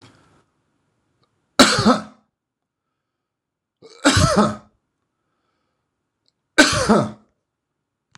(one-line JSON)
{"three_cough_length": "8.2 s", "three_cough_amplitude": 26028, "three_cough_signal_mean_std_ratio": 0.31, "survey_phase": "beta (2021-08-13 to 2022-03-07)", "age": "45-64", "gender": "Male", "wearing_mask": "No", "symptom_none": true, "smoker_status": "Current smoker (11 or more cigarettes per day)", "respiratory_condition_asthma": false, "respiratory_condition_other": false, "recruitment_source": "REACT", "submission_delay": "1 day", "covid_test_result": "Negative", "covid_test_method": "RT-qPCR"}